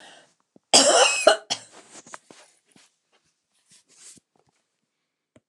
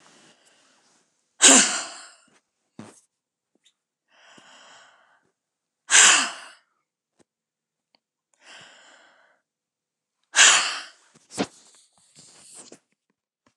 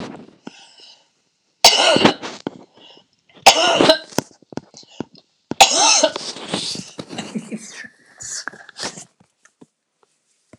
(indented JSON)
{
  "cough_length": "5.5 s",
  "cough_amplitude": 29157,
  "cough_signal_mean_std_ratio": 0.27,
  "exhalation_length": "13.6 s",
  "exhalation_amplitude": 29204,
  "exhalation_signal_mean_std_ratio": 0.23,
  "three_cough_length": "10.6 s",
  "three_cough_amplitude": 29204,
  "three_cough_signal_mean_std_ratio": 0.36,
  "survey_phase": "alpha (2021-03-01 to 2021-08-12)",
  "age": "65+",
  "gender": "Female",
  "wearing_mask": "No",
  "symptom_none": true,
  "smoker_status": "Never smoked",
  "respiratory_condition_asthma": false,
  "respiratory_condition_other": false,
  "recruitment_source": "REACT",
  "submission_delay": "2 days",
  "covid_test_result": "Negative",
  "covid_test_method": "RT-qPCR"
}